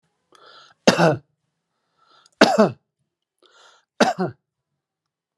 {"three_cough_length": "5.4 s", "three_cough_amplitude": 32767, "three_cough_signal_mean_std_ratio": 0.28, "survey_phase": "alpha (2021-03-01 to 2021-08-12)", "age": "45-64", "gender": "Male", "wearing_mask": "No", "symptom_none": true, "smoker_status": "Ex-smoker", "respiratory_condition_asthma": false, "respiratory_condition_other": false, "recruitment_source": "REACT", "submission_delay": "1 day", "covid_test_result": "Negative", "covid_test_method": "RT-qPCR"}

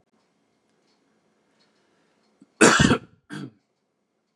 {"cough_length": "4.4 s", "cough_amplitude": 29140, "cough_signal_mean_std_ratio": 0.23, "survey_phase": "beta (2021-08-13 to 2022-03-07)", "age": "18-44", "gender": "Male", "wearing_mask": "No", "symptom_cough_any": true, "symptom_runny_or_blocked_nose": true, "symptom_fatigue": true, "symptom_fever_high_temperature": true, "symptom_onset": "4 days", "smoker_status": "Never smoked", "respiratory_condition_asthma": false, "respiratory_condition_other": false, "recruitment_source": "Test and Trace", "submission_delay": "2 days", "covid_test_result": "Positive", "covid_test_method": "RT-qPCR", "covid_ct_value": 26.2, "covid_ct_gene": "ORF1ab gene", "covid_ct_mean": 26.6, "covid_viral_load": "1900 copies/ml", "covid_viral_load_category": "Minimal viral load (< 10K copies/ml)"}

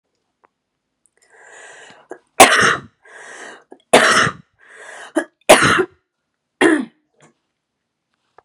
{"three_cough_length": "8.4 s", "three_cough_amplitude": 32768, "three_cough_signal_mean_std_ratio": 0.32, "survey_phase": "beta (2021-08-13 to 2022-03-07)", "age": "18-44", "gender": "Female", "wearing_mask": "No", "symptom_cough_any": true, "symptom_runny_or_blocked_nose": true, "symptom_headache": true, "symptom_change_to_sense_of_smell_or_taste": true, "symptom_loss_of_taste": true, "symptom_onset": "4 days", "smoker_status": "Never smoked", "respiratory_condition_asthma": true, "respiratory_condition_other": false, "recruitment_source": "Test and Trace", "submission_delay": "2 days", "covid_test_result": "Positive", "covid_test_method": "RT-qPCR", "covid_ct_value": 13.0, "covid_ct_gene": "ORF1ab gene", "covid_ct_mean": 13.4, "covid_viral_load": "40000000 copies/ml", "covid_viral_load_category": "High viral load (>1M copies/ml)"}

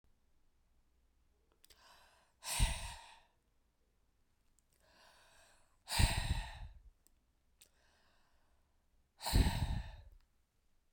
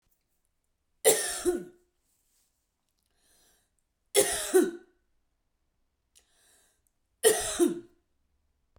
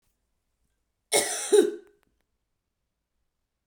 {"exhalation_length": "10.9 s", "exhalation_amplitude": 5623, "exhalation_signal_mean_std_ratio": 0.3, "three_cough_length": "8.8 s", "three_cough_amplitude": 15193, "three_cough_signal_mean_std_ratio": 0.3, "cough_length": "3.7 s", "cough_amplitude": 15006, "cough_signal_mean_std_ratio": 0.27, "survey_phase": "beta (2021-08-13 to 2022-03-07)", "age": "45-64", "gender": "Female", "wearing_mask": "No", "symptom_none": true, "symptom_onset": "4 days", "smoker_status": "Never smoked", "respiratory_condition_asthma": false, "respiratory_condition_other": false, "recruitment_source": "REACT", "submission_delay": "4 days", "covid_test_result": "Negative", "covid_test_method": "RT-qPCR"}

